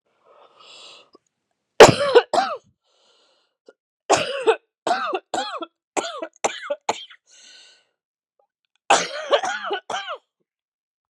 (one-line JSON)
{"three_cough_length": "11.1 s", "three_cough_amplitude": 32768, "three_cough_signal_mean_std_ratio": 0.3, "survey_phase": "beta (2021-08-13 to 2022-03-07)", "age": "45-64", "gender": "Female", "wearing_mask": "No", "symptom_cough_any": true, "symptom_runny_or_blocked_nose": true, "symptom_change_to_sense_of_smell_or_taste": true, "symptom_loss_of_taste": true, "symptom_onset": "6 days", "smoker_status": "Never smoked", "respiratory_condition_asthma": false, "respiratory_condition_other": false, "recruitment_source": "REACT", "submission_delay": "3 days", "covid_test_result": "Negative", "covid_test_method": "RT-qPCR", "influenza_a_test_result": "Negative", "influenza_b_test_result": "Negative"}